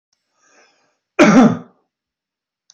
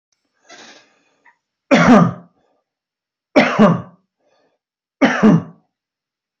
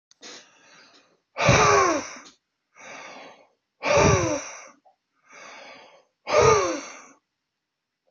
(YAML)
cough_length: 2.7 s
cough_amplitude: 28234
cough_signal_mean_std_ratio: 0.31
three_cough_length: 6.4 s
three_cough_amplitude: 28100
three_cough_signal_mean_std_ratio: 0.35
exhalation_length: 8.1 s
exhalation_amplitude: 18833
exhalation_signal_mean_std_ratio: 0.4
survey_phase: alpha (2021-03-01 to 2021-08-12)
age: 45-64
gender: Male
wearing_mask: 'No'
symptom_none: true
smoker_status: Never smoked
respiratory_condition_asthma: true
respiratory_condition_other: false
recruitment_source: REACT
submission_delay: 1 day
covid_test_result: Negative
covid_test_method: RT-qPCR